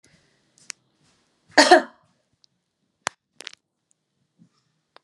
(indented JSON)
{
  "cough_length": "5.0 s",
  "cough_amplitude": 31118,
  "cough_signal_mean_std_ratio": 0.17,
  "survey_phase": "alpha (2021-03-01 to 2021-08-12)",
  "age": "45-64",
  "gender": "Female",
  "wearing_mask": "No",
  "symptom_none": true,
  "smoker_status": "Never smoked",
  "respiratory_condition_asthma": false,
  "respiratory_condition_other": false,
  "recruitment_source": "REACT",
  "submission_delay": "1 day",
  "covid_test_result": "Negative",
  "covid_test_method": "RT-qPCR"
}